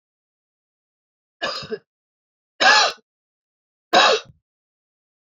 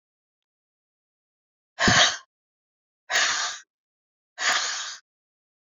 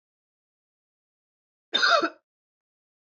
{"three_cough_length": "5.3 s", "three_cough_amplitude": 27277, "three_cough_signal_mean_std_ratio": 0.29, "exhalation_length": "5.6 s", "exhalation_amplitude": 21532, "exhalation_signal_mean_std_ratio": 0.36, "cough_length": "3.1 s", "cough_amplitude": 13315, "cough_signal_mean_std_ratio": 0.26, "survey_phase": "beta (2021-08-13 to 2022-03-07)", "age": "18-44", "gender": "Female", "wearing_mask": "No", "symptom_cough_any": true, "symptom_runny_or_blocked_nose": true, "symptom_shortness_of_breath": true, "symptom_fatigue": true, "symptom_headache": true, "symptom_change_to_sense_of_smell_or_taste": true, "symptom_loss_of_taste": true, "smoker_status": "Never smoked", "respiratory_condition_asthma": false, "respiratory_condition_other": false, "recruitment_source": "Test and Trace", "submission_delay": "2 days", "covid_test_result": "Positive", "covid_test_method": "RT-qPCR", "covid_ct_value": 18.9, "covid_ct_gene": "N gene", "covid_ct_mean": 19.2, "covid_viral_load": "510000 copies/ml", "covid_viral_load_category": "Low viral load (10K-1M copies/ml)"}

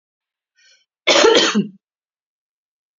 {"cough_length": "3.0 s", "cough_amplitude": 32442, "cough_signal_mean_std_ratio": 0.36, "survey_phase": "beta (2021-08-13 to 2022-03-07)", "age": "45-64", "gender": "Female", "wearing_mask": "No", "symptom_none": true, "smoker_status": "Never smoked", "respiratory_condition_asthma": false, "respiratory_condition_other": false, "recruitment_source": "Test and Trace", "submission_delay": "1 day", "covid_test_result": "Negative", "covid_test_method": "RT-qPCR"}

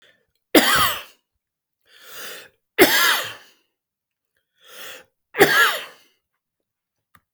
{"three_cough_length": "7.3 s", "three_cough_amplitude": 32768, "three_cough_signal_mean_std_ratio": 0.34, "survey_phase": "beta (2021-08-13 to 2022-03-07)", "age": "45-64", "gender": "Male", "wearing_mask": "No", "symptom_none": true, "smoker_status": "Ex-smoker", "respiratory_condition_asthma": false, "respiratory_condition_other": false, "recruitment_source": "REACT", "submission_delay": "1 day", "covid_test_result": "Negative", "covid_test_method": "RT-qPCR", "influenza_a_test_result": "Negative", "influenza_b_test_result": "Negative"}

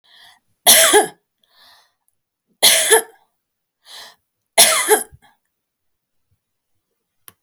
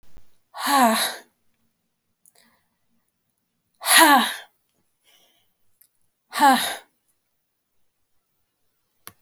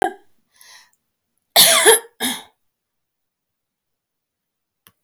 {"three_cough_length": "7.4 s", "three_cough_amplitude": 32768, "three_cough_signal_mean_std_ratio": 0.31, "exhalation_length": "9.2 s", "exhalation_amplitude": 28198, "exhalation_signal_mean_std_ratio": 0.3, "cough_length": "5.0 s", "cough_amplitude": 32768, "cough_signal_mean_std_ratio": 0.27, "survey_phase": "alpha (2021-03-01 to 2021-08-12)", "age": "45-64", "gender": "Female", "wearing_mask": "No", "symptom_none": true, "symptom_abdominal_pain": true, "symptom_onset": "5 days", "smoker_status": "Never smoked", "respiratory_condition_asthma": false, "respiratory_condition_other": true, "recruitment_source": "REACT", "submission_delay": "2 days", "covid_test_result": "Negative", "covid_test_method": "RT-qPCR"}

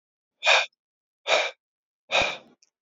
{"exhalation_length": "2.8 s", "exhalation_amplitude": 15858, "exhalation_signal_mean_std_ratio": 0.38, "survey_phase": "alpha (2021-03-01 to 2021-08-12)", "age": "45-64", "gender": "Male", "wearing_mask": "No", "symptom_none": true, "smoker_status": "Never smoked", "respiratory_condition_asthma": false, "respiratory_condition_other": false, "recruitment_source": "REACT", "submission_delay": "3 days", "covid_test_result": "Negative", "covid_test_method": "RT-qPCR"}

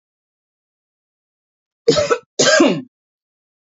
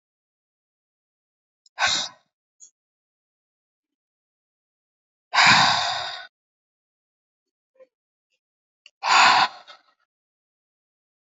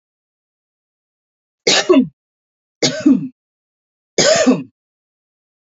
{"cough_length": "3.8 s", "cough_amplitude": 30579, "cough_signal_mean_std_ratio": 0.34, "exhalation_length": "11.3 s", "exhalation_amplitude": 25891, "exhalation_signal_mean_std_ratio": 0.27, "three_cough_length": "5.6 s", "three_cough_amplitude": 31639, "three_cough_signal_mean_std_ratio": 0.36, "survey_phase": "alpha (2021-03-01 to 2021-08-12)", "age": "18-44", "gender": "Female", "wearing_mask": "No", "symptom_none": true, "smoker_status": "Current smoker (1 to 10 cigarettes per day)", "respiratory_condition_asthma": false, "respiratory_condition_other": false, "recruitment_source": "REACT", "submission_delay": "5 days", "covid_test_result": "Negative", "covid_test_method": "RT-qPCR"}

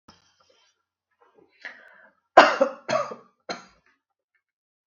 {"three_cough_length": "4.9 s", "three_cough_amplitude": 32768, "three_cough_signal_mean_std_ratio": 0.21, "survey_phase": "beta (2021-08-13 to 2022-03-07)", "age": "45-64", "gender": "Female", "wearing_mask": "No", "symptom_none": true, "smoker_status": "Never smoked", "respiratory_condition_asthma": false, "respiratory_condition_other": false, "recruitment_source": "REACT", "submission_delay": "1 day", "covid_test_result": "Negative", "covid_test_method": "RT-qPCR"}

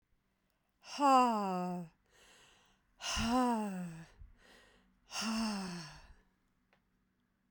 {"exhalation_length": "7.5 s", "exhalation_amplitude": 4969, "exhalation_signal_mean_std_ratio": 0.46, "survey_phase": "beta (2021-08-13 to 2022-03-07)", "age": "45-64", "gender": "Female", "wearing_mask": "Yes", "symptom_sore_throat": true, "symptom_fatigue": true, "symptom_onset": "6 days", "smoker_status": "Never smoked", "respiratory_condition_asthma": false, "respiratory_condition_other": false, "recruitment_source": "Test and Trace", "submission_delay": "2 days", "covid_test_result": "Positive", "covid_test_method": "RT-qPCR", "covid_ct_value": 37.2, "covid_ct_gene": "ORF1ab gene"}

